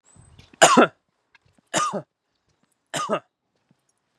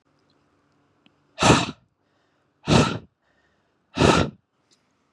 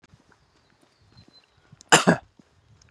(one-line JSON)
{"three_cough_length": "4.2 s", "three_cough_amplitude": 32768, "three_cough_signal_mean_std_ratio": 0.28, "exhalation_length": "5.1 s", "exhalation_amplitude": 27536, "exhalation_signal_mean_std_ratio": 0.31, "cough_length": "2.9 s", "cough_amplitude": 31554, "cough_signal_mean_std_ratio": 0.2, "survey_phase": "beta (2021-08-13 to 2022-03-07)", "age": "18-44", "gender": "Male", "wearing_mask": "No", "symptom_none": true, "symptom_onset": "9 days", "smoker_status": "Never smoked", "respiratory_condition_asthma": false, "respiratory_condition_other": false, "recruitment_source": "Test and Trace", "submission_delay": "7 days", "covid_test_result": "Negative", "covid_test_method": "RT-qPCR"}